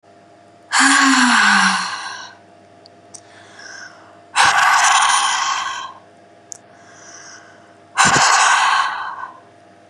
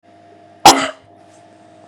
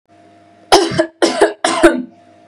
{
  "exhalation_length": "9.9 s",
  "exhalation_amplitude": 32768,
  "exhalation_signal_mean_std_ratio": 0.58,
  "cough_length": "1.9 s",
  "cough_amplitude": 32768,
  "cough_signal_mean_std_ratio": 0.26,
  "three_cough_length": "2.5 s",
  "three_cough_amplitude": 32768,
  "three_cough_signal_mean_std_ratio": 0.49,
  "survey_phase": "beta (2021-08-13 to 2022-03-07)",
  "age": "18-44",
  "gender": "Female",
  "wearing_mask": "No",
  "symptom_none": true,
  "smoker_status": "Never smoked",
  "respiratory_condition_asthma": false,
  "respiratory_condition_other": false,
  "recruitment_source": "REACT",
  "submission_delay": "2 days",
  "covid_test_result": "Negative",
  "covid_test_method": "RT-qPCR",
  "influenza_a_test_result": "Negative",
  "influenza_b_test_result": "Negative"
}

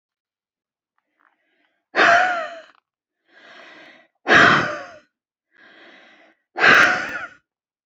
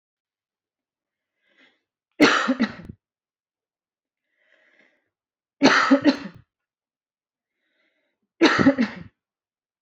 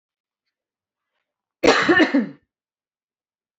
{
  "exhalation_length": "7.9 s",
  "exhalation_amplitude": 28394,
  "exhalation_signal_mean_std_ratio": 0.35,
  "three_cough_length": "9.8 s",
  "three_cough_amplitude": 26929,
  "three_cough_signal_mean_std_ratio": 0.29,
  "cough_length": "3.6 s",
  "cough_amplitude": 26932,
  "cough_signal_mean_std_ratio": 0.32,
  "survey_phase": "beta (2021-08-13 to 2022-03-07)",
  "age": "18-44",
  "gender": "Female",
  "wearing_mask": "No",
  "symptom_runny_or_blocked_nose": true,
  "symptom_onset": "13 days",
  "smoker_status": "Never smoked",
  "respiratory_condition_asthma": false,
  "respiratory_condition_other": false,
  "recruitment_source": "REACT",
  "submission_delay": "1 day",
  "covid_test_result": "Negative",
  "covid_test_method": "RT-qPCR",
  "influenza_a_test_result": "Negative",
  "influenza_b_test_result": "Negative"
}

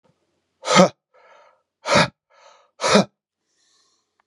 {
  "exhalation_length": "4.3 s",
  "exhalation_amplitude": 32741,
  "exhalation_signal_mean_std_ratio": 0.29,
  "survey_phase": "beta (2021-08-13 to 2022-03-07)",
  "age": "45-64",
  "gender": "Male",
  "wearing_mask": "No",
  "symptom_cough_any": true,
  "symptom_onset": "12 days",
  "smoker_status": "Current smoker (1 to 10 cigarettes per day)",
  "respiratory_condition_asthma": false,
  "respiratory_condition_other": false,
  "recruitment_source": "REACT",
  "submission_delay": "1 day",
  "covid_test_result": "Negative",
  "covid_test_method": "RT-qPCR",
  "influenza_a_test_result": "Negative",
  "influenza_b_test_result": "Negative"
}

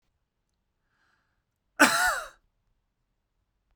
{
  "cough_length": "3.8 s",
  "cough_amplitude": 20046,
  "cough_signal_mean_std_ratio": 0.24,
  "survey_phase": "beta (2021-08-13 to 2022-03-07)",
  "age": "18-44",
  "gender": "Male",
  "wearing_mask": "No",
  "symptom_none": true,
  "smoker_status": "Never smoked",
  "respiratory_condition_asthma": false,
  "respiratory_condition_other": false,
  "recruitment_source": "REACT",
  "submission_delay": "2 days",
  "covid_test_result": "Negative",
  "covid_test_method": "RT-qPCR"
}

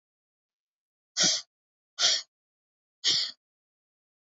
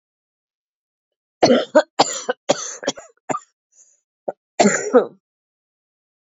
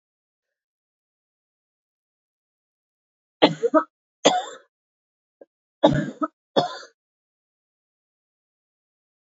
{
  "exhalation_length": "4.4 s",
  "exhalation_amplitude": 11275,
  "exhalation_signal_mean_std_ratio": 0.31,
  "cough_length": "6.3 s",
  "cough_amplitude": 28613,
  "cough_signal_mean_std_ratio": 0.31,
  "three_cough_length": "9.2 s",
  "three_cough_amplitude": 27883,
  "three_cough_signal_mean_std_ratio": 0.22,
  "survey_phase": "beta (2021-08-13 to 2022-03-07)",
  "age": "45-64",
  "gender": "Female",
  "wearing_mask": "No",
  "symptom_cough_any": true,
  "symptom_new_continuous_cough": true,
  "symptom_runny_or_blocked_nose": true,
  "symptom_sore_throat": true,
  "symptom_fatigue": true,
  "symptom_headache": true,
  "symptom_onset": "2 days",
  "smoker_status": "Never smoked",
  "respiratory_condition_asthma": true,
  "respiratory_condition_other": false,
  "recruitment_source": "Test and Trace",
  "submission_delay": "2 days",
  "covid_test_result": "Positive",
  "covid_test_method": "RT-qPCR"
}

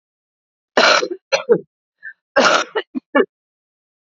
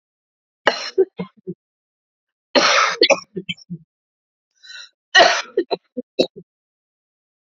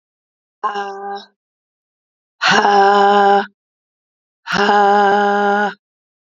{
  "cough_length": "4.1 s",
  "cough_amplitude": 29719,
  "cough_signal_mean_std_ratio": 0.39,
  "three_cough_length": "7.5 s",
  "three_cough_amplitude": 32768,
  "three_cough_signal_mean_std_ratio": 0.32,
  "exhalation_length": "6.3 s",
  "exhalation_amplitude": 29933,
  "exhalation_signal_mean_std_ratio": 0.54,
  "survey_phase": "alpha (2021-03-01 to 2021-08-12)",
  "age": "45-64",
  "gender": "Female",
  "wearing_mask": "No",
  "symptom_cough_any": true,
  "symptom_shortness_of_breath": true,
  "symptom_fatigue": true,
  "symptom_fever_high_temperature": true,
  "symptom_headache": true,
  "symptom_loss_of_taste": true,
  "symptom_onset": "5 days",
  "smoker_status": "Ex-smoker",
  "respiratory_condition_asthma": false,
  "respiratory_condition_other": false,
  "recruitment_source": "Test and Trace",
  "submission_delay": "2 days",
  "covid_test_result": "Positive",
  "covid_test_method": "RT-qPCR",
  "covid_ct_value": 17.6,
  "covid_ct_gene": "ORF1ab gene",
  "covid_ct_mean": 18.4,
  "covid_viral_load": "910000 copies/ml",
  "covid_viral_load_category": "Low viral load (10K-1M copies/ml)"
}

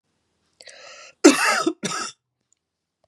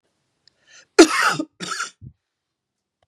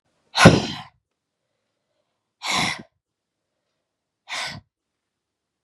{
  "three_cough_length": "3.1 s",
  "three_cough_amplitude": 32767,
  "three_cough_signal_mean_std_ratio": 0.31,
  "cough_length": "3.1 s",
  "cough_amplitude": 32767,
  "cough_signal_mean_std_ratio": 0.27,
  "exhalation_length": "5.6 s",
  "exhalation_amplitude": 32768,
  "exhalation_signal_mean_std_ratio": 0.23,
  "survey_phase": "beta (2021-08-13 to 2022-03-07)",
  "age": "45-64",
  "gender": "Female",
  "wearing_mask": "No",
  "symptom_cough_any": true,
  "symptom_runny_or_blocked_nose": true,
  "symptom_fatigue": true,
  "symptom_headache": true,
  "smoker_status": "Ex-smoker",
  "respiratory_condition_asthma": false,
  "respiratory_condition_other": false,
  "recruitment_source": "Test and Trace",
  "submission_delay": "1 day",
  "covid_test_result": "Positive",
  "covid_test_method": "RT-qPCR",
  "covid_ct_value": 28.3,
  "covid_ct_gene": "N gene",
  "covid_ct_mean": 28.8,
  "covid_viral_load": "350 copies/ml",
  "covid_viral_load_category": "Minimal viral load (< 10K copies/ml)"
}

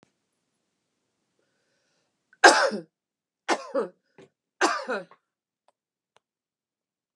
{
  "three_cough_length": "7.2 s",
  "three_cough_amplitude": 30926,
  "three_cough_signal_mean_std_ratio": 0.22,
  "survey_phase": "beta (2021-08-13 to 2022-03-07)",
  "age": "65+",
  "gender": "Female",
  "wearing_mask": "No",
  "symptom_none": true,
  "smoker_status": "Ex-smoker",
  "respiratory_condition_asthma": false,
  "respiratory_condition_other": false,
  "recruitment_source": "REACT",
  "submission_delay": "2 days",
  "covid_test_result": "Negative",
  "covid_test_method": "RT-qPCR"
}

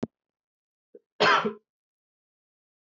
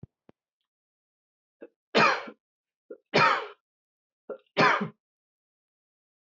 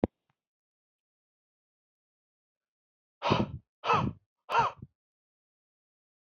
{
  "cough_length": "2.9 s",
  "cough_amplitude": 11921,
  "cough_signal_mean_std_ratio": 0.26,
  "three_cough_length": "6.4 s",
  "three_cough_amplitude": 13005,
  "three_cough_signal_mean_std_ratio": 0.29,
  "exhalation_length": "6.3 s",
  "exhalation_amplitude": 9698,
  "exhalation_signal_mean_std_ratio": 0.27,
  "survey_phase": "beta (2021-08-13 to 2022-03-07)",
  "age": "18-44",
  "gender": "Male",
  "wearing_mask": "No",
  "symptom_cough_any": true,
  "symptom_runny_or_blocked_nose": true,
  "symptom_sore_throat": true,
  "symptom_fatigue": true,
  "symptom_headache": true,
  "smoker_status": "Never smoked",
  "respiratory_condition_asthma": false,
  "respiratory_condition_other": false,
  "recruitment_source": "Test and Trace",
  "submission_delay": "1 day",
  "covid_test_result": "Positive",
  "covid_test_method": "RT-qPCR",
  "covid_ct_value": 20.6,
  "covid_ct_gene": "S gene",
  "covid_ct_mean": 23.0,
  "covid_viral_load": "28000 copies/ml",
  "covid_viral_load_category": "Low viral load (10K-1M copies/ml)"
}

